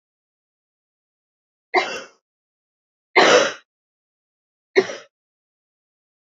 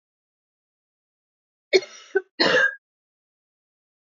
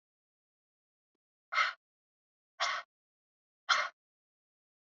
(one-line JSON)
{"three_cough_length": "6.3 s", "three_cough_amplitude": 29305, "three_cough_signal_mean_std_ratio": 0.24, "cough_length": "4.1 s", "cough_amplitude": 18927, "cough_signal_mean_std_ratio": 0.27, "exhalation_length": "4.9 s", "exhalation_amplitude": 5883, "exhalation_signal_mean_std_ratio": 0.26, "survey_phase": "beta (2021-08-13 to 2022-03-07)", "age": "18-44", "gender": "Female", "wearing_mask": "No", "symptom_cough_any": true, "symptom_runny_or_blocked_nose": true, "symptom_sore_throat": true, "symptom_fatigue": true, "symptom_headache": true, "smoker_status": "Never smoked", "respiratory_condition_asthma": false, "respiratory_condition_other": false, "recruitment_source": "Test and Trace", "submission_delay": "2 days", "covid_test_result": "Positive", "covid_test_method": "RT-qPCR", "covid_ct_value": 25.7, "covid_ct_gene": "ORF1ab gene"}